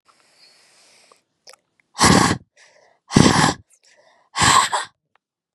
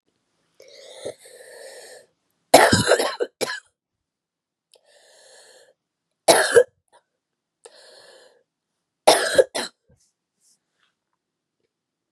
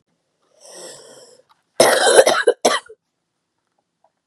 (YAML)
exhalation_length: 5.5 s
exhalation_amplitude: 32768
exhalation_signal_mean_std_ratio: 0.36
three_cough_length: 12.1 s
three_cough_amplitude: 32768
three_cough_signal_mean_std_ratio: 0.26
cough_length: 4.3 s
cough_amplitude: 32768
cough_signal_mean_std_ratio: 0.35
survey_phase: beta (2021-08-13 to 2022-03-07)
age: 18-44
gender: Female
wearing_mask: 'No'
symptom_cough_any: true
symptom_runny_or_blocked_nose: true
symptom_sore_throat: true
symptom_fatigue: true
symptom_headache: true
symptom_onset: 2 days
smoker_status: Never smoked
respiratory_condition_asthma: false
respiratory_condition_other: false
recruitment_source: Test and Trace
submission_delay: 2 days
covid_test_result: Positive
covid_test_method: RT-qPCR
covid_ct_value: 33.6
covid_ct_gene: N gene